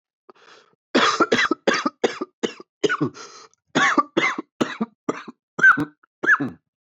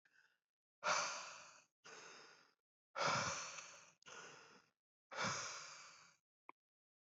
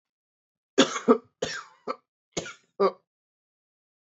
{"cough_length": "6.8 s", "cough_amplitude": 20165, "cough_signal_mean_std_ratio": 0.45, "exhalation_length": "7.1 s", "exhalation_amplitude": 1702, "exhalation_signal_mean_std_ratio": 0.43, "three_cough_length": "4.2 s", "three_cough_amplitude": 17990, "three_cough_signal_mean_std_ratio": 0.27, "survey_phase": "beta (2021-08-13 to 2022-03-07)", "age": "18-44", "gender": "Male", "wearing_mask": "No", "symptom_cough_any": true, "symptom_sore_throat": true, "symptom_fatigue": true, "symptom_headache": true, "symptom_onset": "3 days", "smoker_status": "Never smoked", "respiratory_condition_asthma": false, "respiratory_condition_other": false, "recruitment_source": "Test and Trace", "submission_delay": "1 day", "covid_test_result": "Positive", "covid_test_method": "ePCR"}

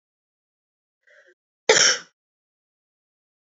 {"cough_length": "3.6 s", "cough_amplitude": 28603, "cough_signal_mean_std_ratio": 0.21, "survey_phase": "beta (2021-08-13 to 2022-03-07)", "age": "18-44", "gender": "Female", "wearing_mask": "No", "symptom_cough_any": true, "symptom_runny_or_blocked_nose": true, "symptom_sore_throat": true, "symptom_fatigue": true, "symptom_headache": true, "smoker_status": "Never smoked", "respiratory_condition_asthma": false, "respiratory_condition_other": false, "recruitment_source": "Test and Trace", "submission_delay": "2 days", "covid_test_result": "Positive", "covid_test_method": "RT-qPCR", "covid_ct_value": 27.3, "covid_ct_gene": "ORF1ab gene"}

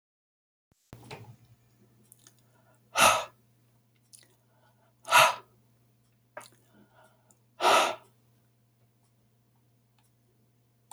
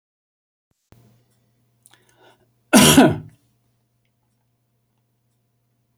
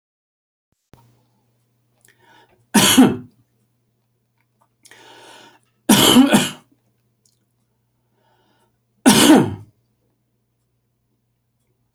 {"exhalation_length": "10.9 s", "exhalation_amplitude": 15722, "exhalation_signal_mean_std_ratio": 0.23, "cough_length": "6.0 s", "cough_amplitude": 32336, "cough_signal_mean_std_ratio": 0.21, "three_cough_length": "11.9 s", "three_cough_amplitude": 32768, "three_cough_signal_mean_std_ratio": 0.28, "survey_phase": "beta (2021-08-13 to 2022-03-07)", "age": "65+", "gender": "Male", "wearing_mask": "No", "symptom_runny_or_blocked_nose": true, "symptom_fatigue": true, "symptom_onset": "13 days", "smoker_status": "Never smoked", "respiratory_condition_asthma": false, "respiratory_condition_other": false, "recruitment_source": "REACT", "submission_delay": "1 day", "covid_test_result": "Negative", "covid_test_method": "RT-qPCR"}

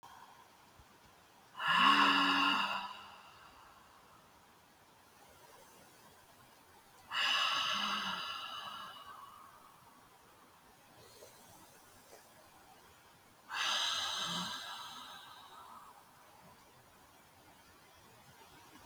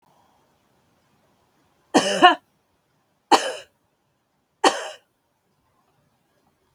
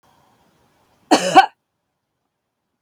{"exhalation_length": "18.9 s", "exhalation_amplitude": 5583, "exhalation_signal_mean_std_ratio": 0.42, "three_cough_length": "6.7 s", "three_cough_amplitude": 32766, "three_cough_signal_mean_std_ratio": 0.23, "cough_length": "2.8 s", "cough_amplitude": 32766, "cough_signal_mean_std_ratio": 0.23, "survey_phase": "beta (2021-08-13 to 2022-03-07)", "age": "45-64", "gender": "Female", "wearing_mask": "No", "symptom_none": true, "smoker_status": "Never smoked", "respiratory_condition_asthma": false, "respiratory_condition_other": false, "recruitment_source": "Test and Trace", "submission_delay": "0 days", "covid_test_result": "Negative", "covid_test_method": "LFT"}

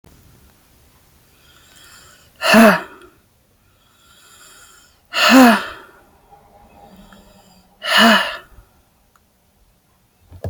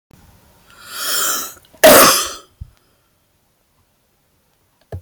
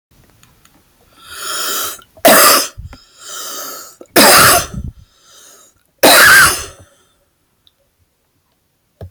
{"exhalation_length": "10.5 s", "exhalation_amplitude": 30646, "exhalation_signal_mean_std_ratio": 0.3, "cough_length": "5.0 s", "cough_amplitude": 32768, "cough_signal_mean_std_ratio": 0.32, "three_cough_length": "9.1 s", "three_cough_amplitude": 32768, "three_cough_signal_mean_std_ratio": 0.42, "survey_phase": "alpha (2021-03-01 to 2021-08-12)", "age": "18-44", "gender": "Female", "wearing_mask": "No", "symptom_none": true, "symptom_onset": "12 days", "smoker_status": "Never smoked", "respiratory_condition_asthma": true, "respiratory_condition_other": false, "recruitment_source": "REACT", "submission_delay": "2 days", "covid_test_result": "Negative", "covid_test_method": "RT-qPCR"}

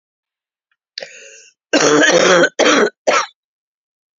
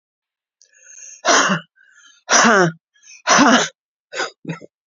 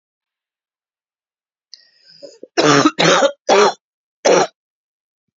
{"cough_length": "4.2 s", "cough_amplitude": 31048, "cough_signal_mean_std_ratio": 0.48, "exhalation_length": "4.9 s", "exhalation_amplitude": 32768, "exhalation_signal_mean_std_ratio": 0.43, "three_cough_length": "5.4 s", "three_cough_amplitude": 32767, "three_cough_signal_mean_std_ratio": 0.38, "survey_phase": "beta (2021-08-13 to 2022-03-07)", "age": "65+", "gender": "Female", "wearing_mask": "No", "symptom_cough_any": true, "symptom_runny_or_blocked_nose": true, "symptom_fatigue": true, "symptom_onset": "5 days", "smoker_status": "Ex-smoker", "respiratory_condition_asthma": false, "respiratory_condition_other": false, "recruitment_source": "Test and Trace", "submission_delay": "2 days", "covid_test_result": "Positive", "covid_test_method": "RT-qPCR", "covid_ct_value": 14.5, "covid_ct_gene": "ORF1ab gene", "covid_ct_mean": 14.7, "covid_viral_load": "15000000 copies/ml", "covid_viral_load_category": "High viral load (>1M copies/ml)"}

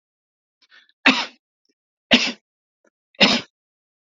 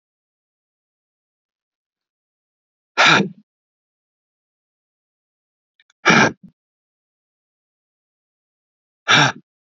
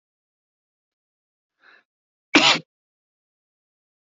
{"three_cough_length": "4.0 s", "three_cough_amplitude": 30222, "three_cough_signal_mean_std_ratio": 0.27, "exhalation_length": "9.6 s", "exhalation_amplitude": 29202, "exhalation_signal_mean_std_ratio": 0.22, "cough_length": "4.2 s", "cough_amplitude": 30554, "cough_signal_mean_std_ratio": 0.18, "survey_phase": "beta (2021-08-13 to 2022-03-07)", "age": "18-44", "gender": "Male", "wearing_mask": "No", "symptom_none": true, "smoker_status": "Never smoked", "respiratory_condition_asthma": false, "respiratory_condition_other": false, "recruitment_source": "REACT", "submission_delay": "3 days", "covid_test_result": "Negative", "covid_test_method": "RT-qPCR", "influenza_a_test_result": "Negative", "influenza_b_test_result": "Negative"}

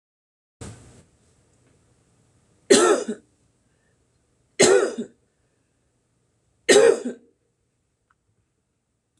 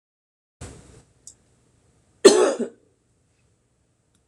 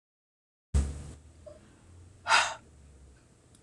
{"three_cough_length": "9.2 s", "three_cough_amplitude": 24705, "three_cough_signal_mean_std_ratio": 0.27, "cough_length": "4.3 s", "cough_amplitude": 26028, "cough_signal_mean_std_ratio": 0.21, "exhalation_length": "3.6 s", "exhalation_amplitude": 11796, "exhalation_signal_mean_std_ratio": 0.32, "survey_phase": "beta (2021-08-13 to 2022-03-07)", "age": "45-64", "gender": "Female", "wearing_mask": "No", "symptom_shortness_of_breath": true, "symptom_sore_throat": true, "symptom_abdominal_pain": true, "symptom_fatigue": true, "symptom_headache": true, "symptom_onset": "13 days", "smoker_status": "Never smoked", "respiratory_condition_asthma": true, "respiratory_condition_other": false, "recruitment_source": "REACT", "submission_delay": "21 days", "covid_test_result": "Negative", "covid_test_method": "RT-qPCR"}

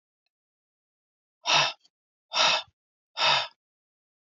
{"exhalation_length": "4.3 s", "exhalation_amplitude": 11290, "exhalation_signal_mean_std_ratio": 0.35, "survey_phase": "beta (2021-08-13 to 2022-03-07)", "age": "45-64", "gender": "Female", "wearing_mask": "No", "symptom_runny_or_blocked_nose": true, "symptom_sore_throat": true, "symptom_fatigue": true, "symptom_headache": true, "symptom_onset": "4 days", "smoker_status": "Ex-smoker", "respiratory_condition_asthma": false, "respiratory_condition_other": false, "recruitment_source": "Test and Trace", "submission_delay": "2 days", "covid_test_result": "Negative", "covid_test_method": "RT-qPCR"}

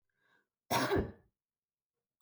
{"cough_length": "2.2 s", "cough_amplitude": 4208, "cough_signal_mean_std_ratio": 0.34, "survey_phase": "beta (2021-08-13 to 2022-03-07)", "age": "18-44", "gender": "Female", "wearing_mask": "No", "symptom_none": true, "smoker_status": "Never smoked", "respiratory_condition_asthma": false, "respiratory_condition_other": false, "recruitment_source": "REACT", "submission_delay": "1 day", "covid_test_result": "Negative", "covid_test_method": "RT-qPCR"}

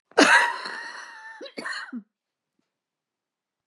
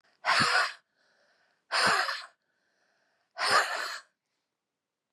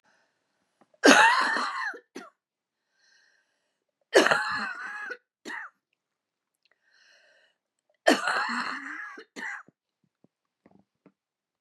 {"cough_length": "3.7 s", "cough_amplitude": 26443, "cough_signal_mean_std_ratio": 0.33, "exhalation_length": "5.1 s", "exhalation_amplitude": 8311, "exhalation_signal_mean_std_ratio": 0.43, "three_cough_length": "11.6 s", "three_cough_amplitude": 32205, "three_cough_signal_mean_std_ratio": 0.32, "survey_phase": "beta (2021-08-13 to 2022-03-07)", "age": "45-64", "gender": "Female", "wearing_mask": "No", "symptom_cough_any": true, "symptom_new_continuous_cough": true, "symptom_runny_or_blocked_nose": true, "symptom_shortness_of_breath": true, "symptom_change_to_sense_of_smell_or_taste": true, "symptom_onset": "4 days", "smoker_status": "Never smoked", "respiratory_condition_asthma": false, "respiratory_condition_other": false, "recruitment_source": "Test and Trace", "submission_delay": "2 days", "covid_test_result": "Positive", "covid_test_method": "RT-qPCR", "covid_ct_value": 14.7, "covid_ct_gene": "N gene", "covid_ct_mean": 15.0, "covid_viral_load": "12000000 copies/ml", "covid_viral_load_category": "High viral load (>1M copies/ml)"}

